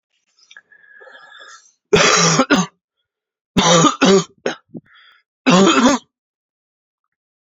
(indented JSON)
{
  "three_cough_length": "7.6 s",
  "three_cough_amplitude": 32368,
  "three_cough_signal_mean_std_ratio": 0.42,
  "survey_phase": "beta (2021-08-13 to 2022-03-07)",
  "age": "18-44",
  "gender": "Male",
  "wearing_mask": "No",
  "symptom_cough_any": true,
  "symptom_new_continuous_cough": true,
  "symptom_runny_or_blocked_nose": true,
  "symptom_shortness_of_breath": true,
  "symptom_sore_throat": true,
  "symptom_diarrhoea": true,
  "symptom_fatigue": true,
  "symptom_fever_high_temperature": true,
  "symptom_headache": true,
  "symptom_change_to_sense_of_smell_or_taste": true,
  "symptom_loss_of_taste": true,
  "smoker_status": "Never smoked",
  "respiratory_condition_asthma": false,
  "respiratory_condition_other": false,
  "recruitment_source": "Test and Trace",
  "submission_delay": "2 days",
  "covid_test_result": "Positive",
  "covid_test_method": "LFT"
}